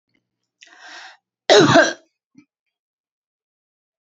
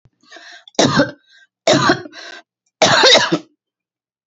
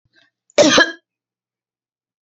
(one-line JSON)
{"cough_length": "4.2 s", "cough_amplitude": 30956, "cough_signal_mean_std_ratio": 0.26, "three_cough_length": "4.3 s", "three_cough_amplitude": 31876, "three_cough_signal_mean_std_ratio": 0.44, "exhalation_length": "2.3 s", "exhalation_amplitude": 28618, "exhalation_signal_mean_std_ratio": 0.29, "survey_phase": "beta (2021-08-13 to 2022-03-07)", "age": "45-64", "gender": "Female", "wearing_mask": "No", "symptom_cough_any": true, "symptom_sore_throat": true, "symptom_fatigue": true, "symptom_onset": "12 days", "smoker_status": "Never smoked", "respiratory_condition_asthma": false, "respiratory_condition_other": false, "recruitment_source": "REACT", "submission_delay": "2 days", "covid_test_result": "Negative", "covid_test_method": "RT-qPCR", "influenza_a_test_result": "Negative", "influenza_b_test_result": "Negative"}